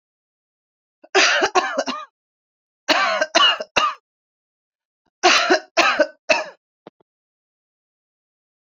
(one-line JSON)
{"three_cough_length": "8.6 s", "three_cough_amplitude": 32741, "three_cough_signal_mean_std_ratio": 0.4, "survey_phase": "beta (2021-08-13 to 2022-03-07)", "age": "65+", "gender": "Male", "wearing_mask": "No", "symptom_fatigue": true, "symptom_headache": true, "symptom_change_to_sense_of_smell_or_taste": true, "symptom_loss_of_taste": true, "symptom_onset": "3 days", "smoker_status": "Never smoked", "respiratory_condition_asthma": false, "respiratory_condition_other": false, "recruitment_source": "Test and Trace", "submission_delay": "1 day", "covid_test_result": "Positive", "covid_test_method": "RT-qPCR", "covid_ct_value": 17.0, "covid_ct_gene": "ORF1ab gene", "covid_ct_mean": 18.0, "covid_viral_load": "1200000 copies/ml", "covid_viral_load_category": "High viral load (>1M copies/ml)"}